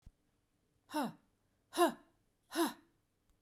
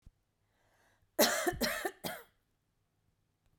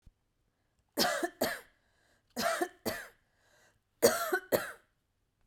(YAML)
exhalation_length: 3.4 s
exhalation_amplitude: 4350
exhalation_signal_mean_std_ratio: 0.3
cough_length: 3.6 s
cough_amplitude: 9175
cough_signal_mean_std_ratio: 0.34
three_cough_length: 5.5 s
three_cough_amplitude: 10231
three_cough_signal_mean_std_ratio: 0.38
survey_phase: beta (2021-08-13 to 2022-03-07)
age: 45-64
gender: Female
wearing_mask: 'No'
symptom_none: true
symptom_onset: 12 days
smoker_status: Never smoked
respiratory_condition_asthma: false
respiratory_condition_other: false
recruitment_source: REACT
submission_delay: 2 days
covid_test_result: Negative
covid_test_method: RT-qPCR